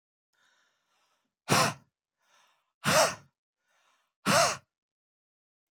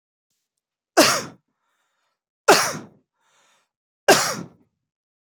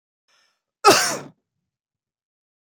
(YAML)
exhalation_length: 5.7 s
exhalation_amplitude: 11186
exhalation_signal_mean_std_ratio: 0.3
three_cough_length: 5.4 s
three_cough_amplitude: 28103
three_cough_signal_mean_std_ratio: 0.27
cough_length: 2.7 s
cough_amplitude: 27277
cough_signal_mean_std_ratio: 0.25
survey_phase: alpha (2021-03-01 to 2021-08-12)
age: 18-44
gender: Male
wearing_mask: 'No'
symptom_none: true
smoker_status: Ex-smoker
respiratory_condition_asthma: false
respiratory_condition_other: false
recruitment_source: REACT
submission_delay: 1 day
covid_test_result: Negative
covid_test_method: RT-qPCR